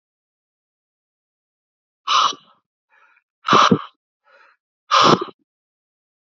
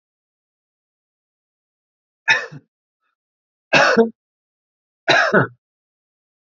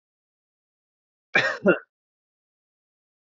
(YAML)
exhalation_length: 6.2 s
exhalation_amplitude: 31116
exhalation_signal_mean_std_ratio: 0.29
three_cough_length: 6.5 s
three_cough_amplitude: 27668
three_cough_signal_mean_std_ratio: 0.29
cough_length: 3.3 s
cough_amplitude: 17423
cough_signal_mean_std_ratio: 0.23
survey_phase: alpha (2021-03-01 to 2021-08-12)
age: 18-44
gender: Male
wearing_mask: 'No'
symptom_none: true
smoker_status: Never smoked
respiratory_condition_asthma: false
respiratory_condition_other: false
recruitment_source: REACT
submission_delay: 2 days
covid_test_result: Negative
covid_test_method: RT-qPCR